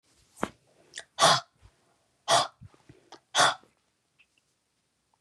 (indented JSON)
{
  "exhalation_length": "5.2 s",
  "exhalation_amplitude": 17064,
  "exhalation_signal_mean_std_ratio": 0.27,
  "survey_phase": "beta (2021-08-13 to 2022-03-07)",
  "age": "65+",
  "gender": "Female",
  "wearing_mask": "No",
  "symptom_none": true,
  "smoker_status": "Ex-smoker",
  "respiratory_condition_asthma": false,
  "respiratory_condition_other": true,
  "recruitment_source": "REACT",
  "submission_delay": "1 day",
  "covid_test_result": "Negative",
  "covid_test_method": "RT-qPCR",
  "influenza_a_test_result": "Negative",
  "influenza_b_test_result": "Negative"
}